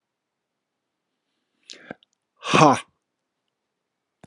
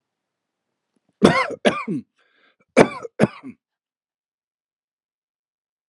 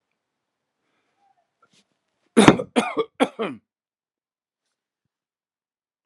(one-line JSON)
{"exhalation_length": "4.3 s", "exhalation_amplitude": 32129, "exhalation_signal_mean_std_ratio": 0.2, "cough_length": "5.9 s", "cough_amplitude": 32768, "cough_signal_mean_std_ratio": 0.25, "three_cough_length": "6.1 s", "three_cough_amplitude": 32768, "three_cough_signal_mean_std_ratio": 0.2, "survey_phase": "beta (2021-08-13 to 2022-03-07)", "age": "45-64", "gender": "Male", "wearing_mask": "No", "symptom_none": true, "smoker_status": "Ex-smoker", "respiratory_condition_asthma": false, "respiratory_condition_other": false, "recruitment_source": "REACT", "submission_delay": "1 day", "covid_test_result": "Negative", "covid_test_method": "RT-qPCR", "influenza_a_test_result": "Negative", "influenza_b_test_result": "Negative"}